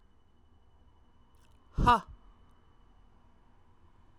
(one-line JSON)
{"exhalation_length": "4.2 s", "exhalation_amplitude": 9987, "exhalation_signal_mean_std_ratio": 0.23, "survey_phase": "alpha (2021-03-01 to 2021-08-12)", "age": "18-44", "gender": "Female", "wearing_mask": "No", "symptom_cough_any": true, "symptom_onset": "8 days", "smoker_status": "Ex-smoker", "respiratory_condition_asthma": false, "respiratory_condition_other": false, "recruitment_source": "REACT", "submission_delay": "1 day", "covid_test_result": "Negative", "covid_test_method": "RT-qPCR"}